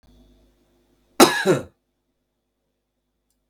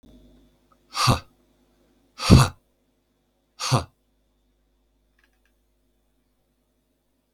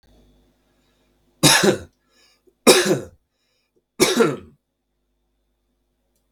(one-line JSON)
{"cough_length": "3.5 s", "cough_amplitude": 32768, "cough_signal_mean_std_ratio": 0.23, "exhalation_length": "7.3 s", "exhalation_amplitude": 32768, "exhalation_signal_mean_std_ratio": 0.21, "three_cough_length": "6.3 s", "three_cough_amplitude": 32768, "three_cough_signal_mean_std_ratio": 0.31, "survey_phase": "beta (2021-08-13 to 2022-03-07)", "age": "45-64", "gender": "Male", "wearing_mask": "No", "symptom_none": true, "smoker_status": "Never smoked", "respiratory_condition_asthma": false, "respiratory_condition_other": false, "recruitment_source": "Test and Trace", "submission_delay": "1 day", "covid_test_result": "Negative", "covid_test_method": "RT-qPCR"}